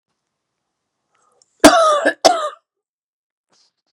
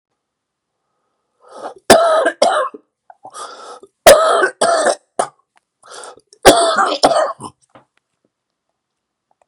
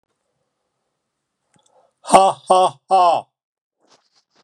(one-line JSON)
{"cough_length": "3.9 s", "cough_amplitude": 32768, "cough_signal_mean_std_ratio": 0.31, "three_cough_length": "9.5 s", "three_cough_amplitude": 32768, "three_cough_signal_mean_std_ratio": 0.4, "exhalation_length": "4.4 s", "exhalation_amplitude": 32768, "exhalation_signal_mean_std_ratio": 0.33, "survey_phase": "beta (2021-08-13 to 2022-03-07)", "age": "45-64", "gender": "Male", "wearing_mask": "No", "symptom_cough_any": true, "symptom_runny_or_blocked_nose": true, "symptom_fatigue": true, "symptom_headache": true, "smoker_status": "Ex-smoker", "respiratory_condition_asthma": false, "respiratory_condition_other": true, "recruitment_source": "Test and Trace", "submission_delay": "3 days", "covid_test_result": "Positive", "covid_test_method": "RT-qPCR", "covid_ct_value": 16.2, "covid_ct_gene": "ORF1ab gene", "covid_ct_mean": 16.3, "covid_viral_load": "4500000 copies/ml", "covid_viral_load_category": "High viral load (>1M copies/ml)"}